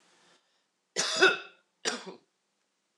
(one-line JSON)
{"cough_length": "3.0 s", "cough_amplitude": 13340, "cough_signal_mean_std_ratio": 0.31, "survey_phase": "beta (2021-08-13 to 2022-03-07)", "age": "18-44", "gender": "Male", "wearing_mask": "No", "symptom_none": true, "smoker_status": "Ex-smoker", "respiratory_condition_asthma": false, "respiratory_condition_other": false, "recruitment_source": "REACT", "submission_delay": "3 days", "covid_test_result": "Negative", "covid_test_method": "RT-qPCR"}